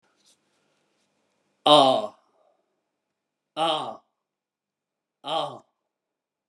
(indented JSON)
{
  "exhalation_length": "6.5 s",
  "exhalation_amplitude": 28563,
  "exhalation_signal_mean_std_ratio": 0.26,
  "survey_phase": "beta (2021-08-13 to 2022-03-07)",
  "age": "45-64",
  "gender": "Male",
  "wearing_mask": "No",
  "symptom_fatigue": true,
  "symptom_onset": "9 days",
  "smoker_status": "Current smoker (1 to 10 cigarettes per day)",
  "respiratory_condition_asthma": false,
  "respiratory_condition_other": false,
  "recruitment_source": "REACT",
  "submission_delay": "1 day",
  "covid_test_result": "Negative",
  "covid_test_method": "RT-qPCR"
}